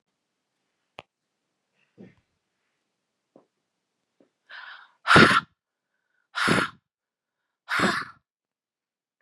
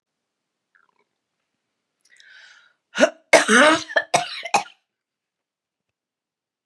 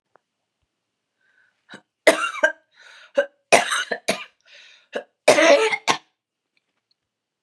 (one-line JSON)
{"exhalation_length": "9.2 s", "exhalation_amplitude": 30060, "exhalation_signal_mean_std_ratio": 0.23, "cough_length": "6.7 s", "cough_amplitude": 32767, "cough_signal_mean_std_ratio": 0.27, "three_cough_length": "7.4 s", "three_cough_amplitude": 32767, "three_cough_signal_mean_std_ratio": 0.32, "survey_phase": "beta (2021-08-13 to 2022-03-07)", "age": "45-64", "gender": "Female", "wearing_mask": "No", "symptom_cough_any": true, "symptom_runny_or_blocked_nose": true, "symptom_sore_throat": true, "symptom_diarrhoea": true, "symptom_fatigue": true, "symptom_headache": true, "symptom_other": true, "symptom_onset": "3 days", "smoker_status": "Never smoked", "respiratory_condition_asthma": false, "respiratory_condition_other": false, "recruitment_source": "Test and Trace", "submission_delay": "1 day", "covid_test_result": "Positive", "covid_test_method": "RT-qPCR", "covid_ct_value": 31.0, "covid_ct_gene": "ORF1ab gene"}